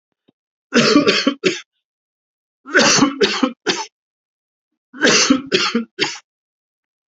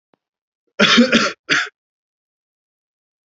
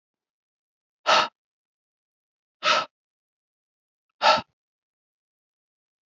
{"three_cough_length": "7.1 s", "three_cough_amplitude": 29716, "three_cough_signal_mean_std_ratio": 0.46, "cough_length": "3.3 s", "cough_amplitude": 32768, "cough_signal_mean_std_ratio": 0.35, "exhalation_length": "6.1 s", "exhalation_amplitude": 20223, "exhalation_signal_mean_std_ratio": 0.24, "survey_phase": "beta (2021-08-13 to 2022-03-07)", "age": "18-44", "gender": "Male", "wearing_mask": "No", "symptom_cough_any": true, "symptom_sore_throat": true, "symptom_fatigue": true, "symptom_other": true, "symptom_onset": "3 days", "smoker_status": "Never smoked", "respiratory_condition_asthma": false, "respiratory_condition_other": false, "recruitment_source": "Test and Trace", "submission_delay": "2 days", "covid_test_result": "Positive", "covid_test_method": "RT-qPCR", "covid_ct_value": 25.1, "covid_ct_gene": "ORF1ab gene", "covid_ct_mean": 25.8, "covid_viral_load": "3300 copies/ml", "covid_viral_load_category": "Minimal viral load (< 10K copies/ml)"}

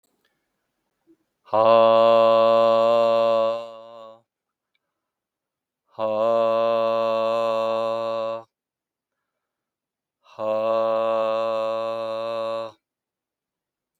{"exhalation_length": "14.0 s", "exhalation_amplitude": 18687, "exhalation_signal_mean_std_ratio": 0.59, "survey_phase": "beta (2021-08-13 to 2022-03-07)", "age": "65+", "gender": "Male", "wearing_mask": "No", "symptom_none": true, "smoker_status": "Never smoked", "respiratory_condition_asthma": false, "respiratory_condition_other": false, "recruitment_source": "REACT", "submission_delay": "4 days", "covid_test_result": "Negative", "covid_test_method": "RT-qPCR", "influenza_a_test_result": "Negative", "influenza_b_test_result": "Negative"}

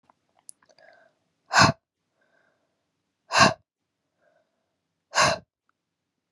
{"exhalation_length": "6.3 s", "exhalation_amplitude": 28085, "exhalation_signal_mean_std_ratio": 0.23, "survey_phase": "beta (2021-08-13 to 2022-03-07)", "age": "18-44", "gender": "Female", "wearing_mask": "No", "symptom_cough_any": true, "symptom_runny_or_blocked_nose": true, "symptom_sore_throat": true, "symptom_fatigue": true, "smoker_status": "Never smoked", "respiratory_condition_asthma": false, "respiratory_condition_other": false, "recruitment_source": "Test and Trace", "submission_delay": "1 day", "covid_test_result": "Positive", "covid_test_method": "RT-qPCR", "covid_ct_value": 19.6, "covid_ct_gene": "ORF1ab gene", "covid_ct_mean": 20.1, "covid_viral_load": "250000 copies/ml", "covid_viral_load_category": "Low viral load (10K-1M copies/ml)"}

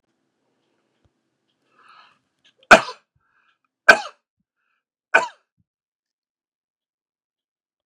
{"three_cough_length": "7.9 s", "three_cough_amplitude": 32768, "three_cough_signal_mean_std_ratio": 0.14, "survey_phase": "beta (2021-08-13 to 2022-03-07)", "age": "65+", "gender": "Male", "wearing_mask": "No", "symptom_none": true, "smoker_status": "Ex-smoker", "respiratory_condition_asthma": false, "respiratory_condition_other": false, "recruitment_source": "REACT", "submission_delay": "2 days", "covid_test_result": "Negative", "covid_test_method": "RT-qPCR", "influenza_a_test_result": "Negative", "influenza_b_test_result": "Negative"}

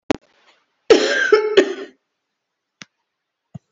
{"cough_length": "3.7 s", "cough_amplitude": 32768, "cough_signal_mean_std_ratio": 0.35, "survey_phase": "beta (2021-08-13 to 2022-03-07)", "age": "45-64", "gender": "Female", "wearing_mask": "No", "symptom_cough_any": true, "symptom_runny_or_blocked_nose": true, "symptom_abdominal_pain": true, "symptom_fatigue": true, "symptom_headache": true, "symptom_change_to_sense_of_smell_or_taste": true, "smoker_status": "Never smoked", "respiratory_condition_asthma": false, "respiratory_condition_other": false, "recruitment_source": "Test and Trace", "submission_delay": "2 days", "covid_test_result": "Positive", "covid_test_method": "RT-qPCR", "covid_ct_value": 17.4, "covid_ct_gene": "ORF1ab gene", "covid_ct_mean": 18.4, "covid_viral_load": "910000 copies/ml", "covid_viral_load_category": "Low viral load (10K-1M copies/ml)"}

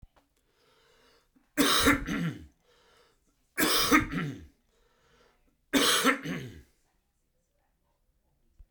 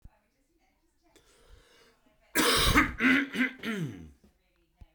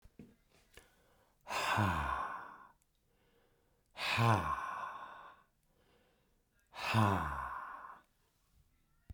{"three_cough_length": "8.7 s", "three_cough_amplitude": 16194, "three_cough_signal_mean_std_ratio": 0.39, "cough_length": "4.9 s", "cough_amplitude": 11260, "cough_signal_mean_std_ratio": 0.42, "exhalation_length": "9.1 s", "exhalation_amplitude": 4248, "exhalation_signal_mean_std_ratio": 0.45, "survey_phase": "beta (2021-08-13 to 2022-03-07)", "age": "45-64", "gender": "Male", "wearing_mask": "No", "symptom_cough_any": true, "symptom_onset": "6 days", "smoker_status": "Never smoked", "respiratory_condition_asthma": false, "respiratory_condition_other": false, "recruitment_source": "Test and Trace", "submission_delay": "1 day", "covid_test_result": "Positive", "covid_test_method": "RT-qPCR"}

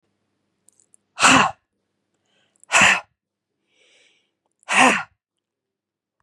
{"exhalation_length": "6.2 s", "exhalation_amplitude": 31100, "exhalation_signal_mean_std_ratio": 0.29, "survey_phase": "beta (2021-08-13 to 2022-03-07)", "age": "45-64", "gender": "Female", "wearing_mask": "Yes", "symptom_shortness_of_breath": true, "symptom_headache": true, "symptom_onset": "9 days", "smoker_status": "Ex-smoker", "respiratory_condition_asthma": true, "respiratory_condition_other": false, "recruitment_source": "REACT", "submission_delay": "2 days", "covid_test_result": "Negative", "covid_test_method": "RT-qPCR", "influenza_a_test_result": "Unknown/Void", "influenza_b_test_result": "Unknown/Void"}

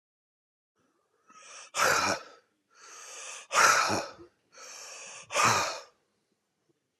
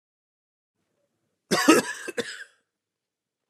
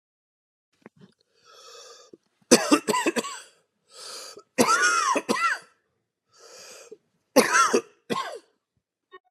{"exhalation_length": "7.0 s", "exhalation_amplitude": 12535, "exhalation_signal_mean_std_ratio": 0.4, "cough_length": "3.5 s", "cough_amplitude": 23037, "cough_signal_mean_std_ratio": 0.27, "three_cough_length": "9.3 s", "three_cough_amplitude": 27779, "three_cough_signal_mean_std_ratio": 0.38, "survey_phase": "beta (2021-08-13 to 2022-03-07)", "age": "45-64", "gender": "Male", "wearing_mask": "No", "symptom_cough_any": true, "symptom_runny_or_blocked_nose": true, "symptom_headache": true, "symptom_change_to_sense_of_smell_or_taste": true, "symptom_other": true, "symptom_onset": "4 days", "smoker_status": "Ex-smoker", "respiratory_condition_asthma": false, "respiratory_condition_other": false, "recruitment_source": "Test and Trace", "submission_delay": "2 days", "covid_test_result": "Positive", "covid_test_method": "RT-qPCR", "covid_ct_value": 28.1, "covid_ct_gene": "ORF1ab gene"}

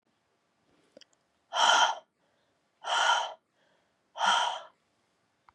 {"exhalation_length": "5.5 s", "exhalation_amplitude": 13615, "exhalation_signal_mean_std_ratio": 0.38, "survey_phase": "beta (2021-08-13 to 2022-03-07)", "age": "45-64", "gender": "Female", "wearing_mask": "No", "symptom_cough_any": true, "symptom_new_continuous_cough": true, "symptom_runny_or_blocked_nose": true, "symptom_shortness_of_breath": true, "symptom_fatigue": true, "symptom_headache": true, "symptom_change_to_sense_of_smell_or_taste": true, "symptom_onset": "4 days", "smoker_status": "Never smoked", "respiratory_condition_asthma": false, "respiratory_condition_other": false, "recruitment_source": "Test and Trace", "submission_delay": "1 day", "covid_test_result": "Positive", "covid_test_method": "RT-qPCR", "covid_ct_value": 24.7, "covid_ct_gene": "ORF1ab gene"}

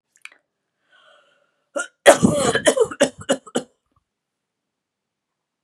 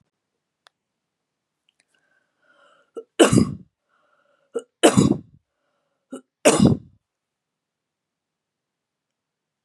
{"cough_length": "5.6 s", "cough_amplitude": 32768, "cough_signal_mean_std_ratio": 0.29, "three_cough_length": "9.6 s", "three_cough_amplitude": 31182, "three_cough_signal_mean_std_ratio": 0.23, "survey_phase": "beta (2021-08-13 to 2022-03-07)", "age": "65+", "gender": "Female", "wearing_mask": "No", "symptom_none": true, "smoker_status": "Never smoked", "respiratory_condition_asthma": false, "respiratory_condition_other": false, "recruitment_source": "REACT", "submission_delay": "1 day", "covid_test_result": "Negative", "covid_test_method": "RT-qPCR", "influenza_a_test_result": "Negative", "influenza_b_test_result": "Negative"}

